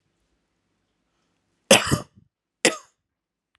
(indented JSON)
{
  "cough_length": "3.6 s",
  "cough_amplitude": 32531,
  "cough_signal_mean_std_ratio": 0.21,
  "survey_phase": "alpha (2021-03-01 to 2021-08-12)",
  "age": "18-44",
  "gender": "Male",
  "wearing_mask": "No",
  "symptom_none": true,
  "symptom_onset": "13 days",
  "smoker_status": "Never smoked",
  "respiratory_condition_asthma": false,
  "respiratory_condition_other": false,
  "recruitment_source": "REACT",
  "submission_delay": "1 day",
  "covid_test_result": "Negative",
  "covid_test_method": "RT-qPCR"
}